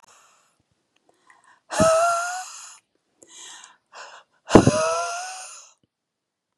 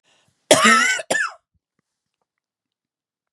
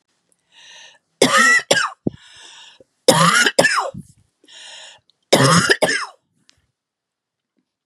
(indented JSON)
{
  "exhalation_length": "6.6 s",
  "exhalation_amplitude": 32768,
  "exhalation_signal_mean_std_ratio": 0.34,
  "cough_length": "3.3 s",
  "cough_amplitude": 32768,
  "cough_signal_mean_std_ratio": 0.34,
  "three_cough_length": "7.9 s",
  "three_cough_amplitude": 32768,
  "three_cough_signal_mean_std_ratio": 0.41,
  "survey_phase": "beta (2021-08-13 to 2022-03-07)",
  "age": "45-64",
  "gender": "Female",
  "wearing_mask": "No",
  "symptom_cough_any": true,
  "symptom_fatigue": true,
  "symptom_headache": true,
  "symptom_onset": "2 days",
  "smoker_status": "Never smoked",
  "respiratory_condition_asthma": false,
  "respiratory_condition_other": false,
  "recruitment_source": "Test and Trace",
  "submission_delay": "1 day",
  "covid_test_result": "Negative",
  "covid_test_method": "RT-qPCR"
}